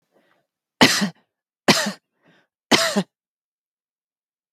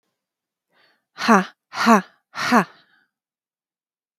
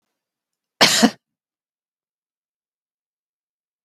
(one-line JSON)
{"three_cough_length": "4.5 s", "three_cough_amplitude": 32768, "three_cough_signal_mean_std_ratio": 0.3, "exhalation_length": "4.2 s", "exhalation_amplitude": 27390, "exhalation_signal_mean_std_ratio": 0.31, "cough_length": "3.8 s", "cough_amplitude": 32768, "cough_signal_mean_std_ratio": 0.2, "survey_phase": "beta (2021-08-13 to 2022-03-07)", "age": "45-64", "gender": "Female", "wearing_mask": "No", "symptom_none": true, "smoker_status": "Never smoked", "respiratory_condition_asthma": false, "respiratory_condition_other": false, "recruitment_source": "REACT", "submission_delay": "2 days", "covid_test_result": "Negative", "covid_test_method": "RT-qPCR", "influenza_a_test_result": "Negative", "influenza_b_test_result": "Negative"}